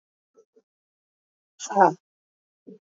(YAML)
exhalation_length: 2.9 s
exhalation_amplitude: 22227
exhalation_signal_mean_std_ratio: 0.2
survey_phase: beta (2021-08-13 to 2022-03-07)
age: 18-44
gender: Female
wearing_mask: 'No'
symptom_cough_any: true
symptom_shortness_of_breath: true
symptom_sore_throat: true
symptom_fatigue: true
symptom_headache: true
symptom_onset: 4 days
smoker_status: Never smoked
respiratory_condition_asthma: false
respiratory_condition_other: false
recruitment_source: Test and Trace
submission_delay: 1 day
covid_test_result: Positive
covid_test_method: RT-qPCR
covid_ct_value: 27.7
covid_ct_gene: N gene